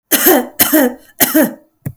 {"three_cough_length": "2.0 s", "three_cough_amplitude": 32768, "three_cough_signal_mean_std_ratio": 0.6, "survey_phase": "beta (2021-08-13 to 2022-03-07)", "age": "45-64", "gender": "Female", "wearing_mask": "No", "symptom_none": true, "smoker_status": "Ex-smoker", "respiratory_condition_asthma": false, "respiratory_condition_other": false, "recruitment_source": "REACT", "submission_delay": "4 days", "covid_test_result": "Negative", "covid_test_method": "RT-qPCR"}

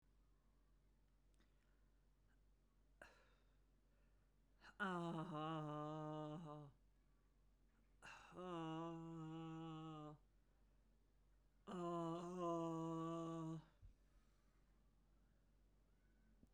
{"exhalation_length": "16.5 s", "exhalation_amplitude": 579, "exhalation_signal_mean_std_ratio": 0.56, "survey_phase": "beta (2021-08-13 to 2022-03-07)", "age": "45-64", "gender": "Female", "wearing_mask": "No", "symptom_none": true, "smoker_status": "Ex-smoker", "respiratory_condition_asthma": false, "respiratory_condition_other": false, "recruitment_source": "REACT", "submission_delay": "2 days", "covid_test_result": "Negative", "covid_test_method": "RT-qPCR"}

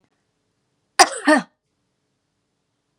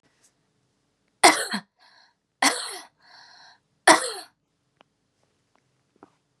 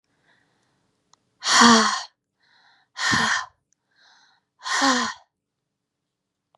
{"cough_length": "3.0 s", "cough_amplitude": 32768, "cough_signal_mean_std_ratio": 0.22, "three_cough_length": "6.4 s", "three_cough_amplitude": 32767, "three_cough_signal_mean_std_ratio": 0.23, "exhalation_length": "6.6 s", "exhalation_amplitude": 29478, "exhalation_signal_mean_std_ratio": 0.35, "survey_phase": "beta (2021-08-13 to 2022-03-07)", "age": "18-44", "gender": "Female", "wearing_mask": "No", "symptom_cough_any": true, "symptom_runny_or_blocked_nose": true, "symptom_fatigue": true, "symptom_headache": true, "symptom_change_to_sense_of_smell_or_taste": true, "smoker_status": "Never smoked", "respiratory_condition_asthma": false, "respiratory_condition_other": false, "recruitment_source": "Test and Trace", "submission_delay": "2 days", "covid_test_result": "Positive", "covid_test_method": "RT-qPCR", "covid_ct_value": 18.8, "covid_ct_gene": "ORF1ab gene", "covid_ct_mean": 19.3, "covid_viral_load": "460000 copies/ml", "covid_viral_load_category": "Low viral load (10K-1M copies/ml)"}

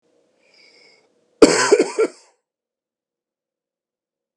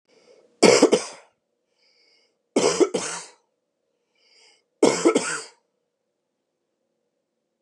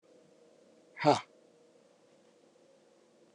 {"cough_length": "4.4 s", "cough_amplitude": 32768, "cough_signal_mean_std_ratio": 0.25, "three_cough_length": "7.6 s", "three_cough_amplitude": 31900, "three_cough_signal_mean_std_ratio": 0.3, "exhalation_length": "3.3 s", "exhalation_amplitude": 9784, "exhalation_signal_mean_std_ratio": 0.2, "survey_phase": "beta (2021-08-13 to 2022-03-07)", "age": "45-64", "gender": "Male", "wearing_mask": "No", "symptom_none": true, "symptom_onset": "12 days", "smoker_status": "Never smoked", "respiratory_condition_asthma": false, "respiratory_condition_other": false, "recruitment_source": "REACT", "submission_delay": "2 days", "covid_test_result": "Negative", "covid_test_method": "RT-qPCR"}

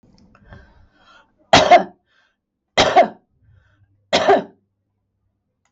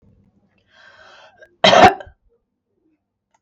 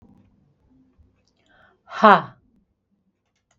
{"three_cough_length": "5.7 s", "three_cough_amplitude": 32768, "three_cough_signal_mean_std_ratio": 0.31, "cough_length": "3.4 s", "cough_amplitude": 32768, "cough_signal_mean_std_ratio": 0.24, "exhalation_length": "3.6 s", "exhalation_amplitude": 32768, "exhalation_signal_mean_std_ratio": 0.18, "survey_phase": "beta (2021-08-13 to 2022-03-07)", "age": "45-64", "gender": "Female", "wearing_mask": "No", "symptom_none": true, "smoker_status": "Current smoker (11 or more cigarettes per day)", "respiratory_condition_asthma": true, "respiratory_condition_other": false, "recruitment_source": "REACT", "submission_delay": "2 days", "covid_test_result": "Negative", "covid_test_method": "RT-qPCR", "influenza_a_test_result": "Negative", "influenza_b_test_result": "Negative"}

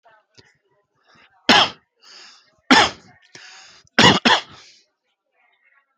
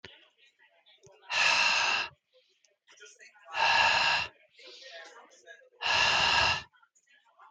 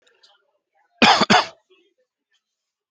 {"three_cough_length": "6.0 s", "three_cough_amplitude": 32768, "three_cough_signal_mean_std_ratio": 0.29, "exhalation_length": "7.5 s", "exhalation_amplitude": 8643, "exhalation_signal_mean_std_ratio": 0.5, "cough_length": "2.9 s", "cough_amplitude": 27855, "cough_signal_mean_std_ratio": 0.28, "survey_phase": "alpha (2021-03-01 to 2021-08-12)", "age": "18-44", "gender": "Male", "wearing_mask": "Yes", "symptom_none": true, "smoker_status": "Never smoked", "respiratory_condition_asthma": true, "respiratory_condition_other": false, "recruitment_source": "REACT", "submission_delay": "2 days", "covid_test_result": "Negative", "covid_test_method": "RT-qPCR"}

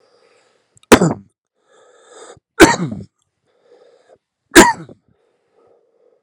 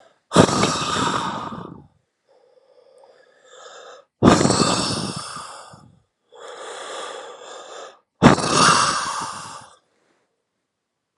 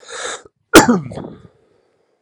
{"three_cough_length": "6.2 s", "three_cough_amplitude": 32768, "three_cough_signal_mean_std_ratio": 0.24, "exhalation_length": "11.2 s", "exhalation_amplitude": 32768, "exhalation_signal_mean_std_ratio": 0.42, "cough_length": "2.2 s", "cough_amplitude": 32768, "cough_signal_mean_std_ratio": 0.32, "survey_phase": "alpha (2021-03-01 to 2021-08-12)", "age": "18-44", "gender": "Male", "wearing_mask": "No", "symptom_shortness_of_breath": true, "symptom_fatigue": true, "symptom_fever_high_temperature": true, "symptom_headache": true, "symptom_change_to_sense_of_smell_or_taste": true, "symptom_loss_of_taste": true, "symptom_onset": "3 days", "smoker_status": "Never smoked", "respiratory_condition_asthma": false, "respiratory_condition_other": false, "recruitment_source": "Test and Trace", "submission_delay": "2 days", "covid_test_result": "Positive", "covid_test_method": "RT-qPCR", "covid_ct_value": 16.0, "covid_ct_gene": "S gene", "covid_ct_mean": 16.2, "covid_viral_load": "4700000 copies/ml", "covid_viral_load_category": "High viral load (>1M copies/ml)"}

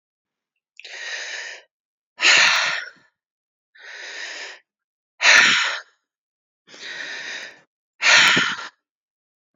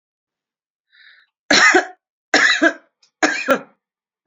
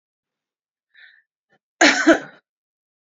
{"exhalation_length": "9.6 s", "exhalation_amplitude": 32768, "exhalation_signal_mean_std_ratio": 0.39, "three_cough_length": "4.3 s", "three_cough_amplitude": 32767, "three_cough_signal_mean_std_ratio": 0.39, "cough_length": "3.2 s", "cough_amplitude": 28901, "cough_signal_mean_std_ratio": 0.25, "survey_phase": "beta (2021-08-13 to 2022-03-07)", "age": "45-64", "gender": "Female", "wearing_mask": "No", "symptom_fatigue": true, "smoker_status": "Ex-smoker", "respiratory_condition_asthma": false, "respiratory_condition_other": false, "recruitment_source": "REACT", "submission_delay": "1 day", "covid_test_result": "Negative", "covid_test_method": "RT-qPCR", "influenza_a_test_result": "Negative", "influenza_b_test_result": "Negative"}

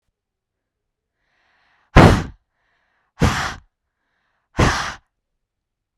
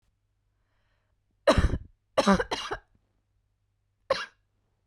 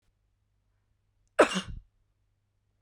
{"exhalation_length": "6.0 s", "exhalation_amplitude": 32768, "exhalation_signal_mean_std_ratio": 0.26, "three_cough_length": "4.9 s", "three_cough_amplitude": 12273, "three_cough_signal_mean_std_ratio": 0.29, "cough_length": "2.8 s", "cough_amplitude": 15806, "cough_signal_mean_std_ratio": 0.19, "survey_phase": "beta (2021-08-13 to 2022-03-07)", "age": "18-44", "gender": "Female", "wearing_mask": "No", "symptom_none": true, "smoker_status": "Never smoked", "respiratory_condition_asthma": false, "respiratory_condition_other": false, "recruitment_source": "REACT", "submission_delay": "2 days", "covid_test_result": "Negative", "covid_test_method": "RT-qPCR", "influenza_a_test_result": "Negative", "influenza_b_test_result": "Negative"}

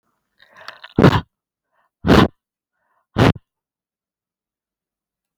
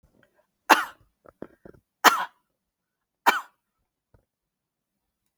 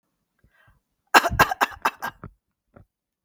{"exhalation_length": "5.4 s", "exhalation_amplitude": 32768, "exhalation_signal_mean_std_ratio": 0.25, "three_cough_length": "5.4 s", "three_cough_amplitude": 32768, "three_cough_signal_mean_std_ratio": 0.19, "cough_length": "3.2 s", "cough_amplitude": 32768, "cough_signal_mean_std_ratio": 0.25, "survey_phase": "beta (2021-08-13 to 2022-03-07)", "age": "65+", "gender": "Female", "wearing_mask": "No", "symptom_none": true, "smoker_status": "Never smoked", "respiratory_condition_asthma": false, "respiratory_condition_other": false, "recruitment_source": "REACT", "submission_delay": "2 days", "covid_test_result": "Negative", "covid_test_method": "RT-qPCR", "influenza_a_test_result": "Negative", "influenza_b_test_result": "Negative"}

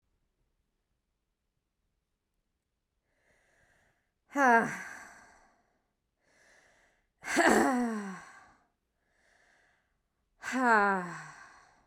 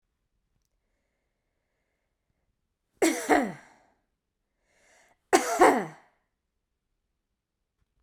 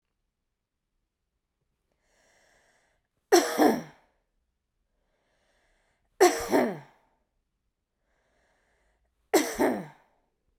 {"exhalation_length": "11.9 s", "exhalation_amplitude": 11815, "exhalation_signal_mean_std_ratio": 0.31, "cough_length": "8.0 s", "cough_amplitude": 17869, "cough_signal_mean_std_ratio": 0.24, "three_cough_length": "10.6 s", "three_cough_amplitude": 16883, "three_cough_signal_mean_std_ratio": 0.26, "survey_phase": "beta (2021-08-13 to 2022-03-07)", "age": "45-64", "gender": "Female", "wearing_mask": "No", "symptom_none": true, "symptom_onset": "11 days", "smoker_status": "Never smoked", "respiratory_condition_asthma": true, "respiratory_condition_other": false, "recruitment_source": "REACT", "submission_delay": "3 days", "covid_test_result": "Negative", "covid_test_method": "RT-qPCR"}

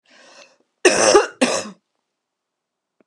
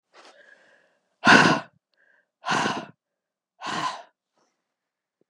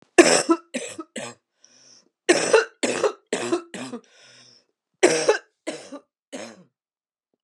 {"cough_length": "3.1 s", "cough_amplitude": 32767, "cough_signal_mean_std_ratio": 0.34, "exhalation_length": "5.3 s", "exhalation_amplitude": 30245, "exhalation_signal_mean_std_ratio": 0.29, "three_cough_length": "7.4 s", "three_cough_amplitude": 32747, "three_cough_signal_mean_std_ratio": 0.36, "survey_phase": "beta (2021-08-13 to 2022-03-07)", "age": "45-64", "gender": "Female", "wearing_mask": "No", "symptom_cough_any": true, "symptom_runny_or_blocked_nose": true, "symptom_sore_throat": true, "symptom_fatigue": true, "symptom_onset": "3 days", "smoker_status": "Never smoked", "respiratory_condition_asthma": false, "respiratory_condition_other": false, "recruitment_source": "Test and Trace", "submission_delay": "1 day", "covid_test_result": "Positive", "covid_test_method": "RT-qPCR", "covid_ct_value": 21.8, "covid_ct_gene": "ORF1ab gene"}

